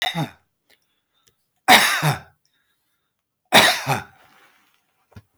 three_cough_length: 5.4 s
three_cough_amplitude: 32768
three_cough_signal_mean_std_ratio: 0.32
survey_phase: beta (2021-08-13 to 2022-03-07)
age: 65+
gender: Male
wearing_mask: 'No'
symptom_none: true
smoker_status: Ex-smoker
respiratory_condition_asthma: false
respiratory_condition_other: false
recruitment_source: REACT
submission_delay: 1 day
covid_test_result: Negative
covid_test_method: RT-qPCR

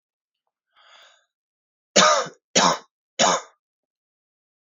three_cough_length: 4.7 s
three_cough_amplitude: 27843
three_cough_signal_mean_std_ratio: 0.31
survey_phase: beta (2021-08-13 to 2022-03-07)
age: 18-44
gender: Male
wearing_mask: 'No'
symptom_cough_any: true
symptom_runny_or_blocked_nose: true
symptom_sore_throat: true
symptom_onset: 3 days
smoker_status: Never smoked
respiratory_condition_asthma: false
respiratory_condition_other: false
recruitment_source: Test and Trace
submission_delay: 1 day
covid_test_result: Positive
covid_test_method: RT-qPCR
covid_ct_value: 30.9
covid_ct_gene: N gene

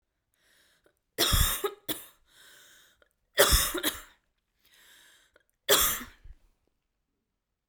three_cough_length: 7.7 s
three_cough_amplitude: 17394
three_cough_signal_mean_std_ratio: 0.33
survey_phase: beta (2021-08-13 to 2022-03-07)
age: 18-44
gender: Female
wearing_mask: 'No'
symptom_cough_any: true
symptom_runny_or_blocked_nose: true
symptom_sore_throat: true
symptom_fatigue: true
symptom_headache: true
smoker_status: Never smoked
respiratory_condition_asthma: false
respiratory_condition_other: false
recruitment_source: Test and Trace
submission_delay: 2 days
covid_test_result: Positive
covid_test_method: RT-qPCR
covid_ct_value: 16.3
covid_ct_gene: ORF1ab gene
covid_ct_mean: 16.5
covid_viral_load: 3800000 copies/ml
covid_viral_load_category: High viral load (>1M copies/ml)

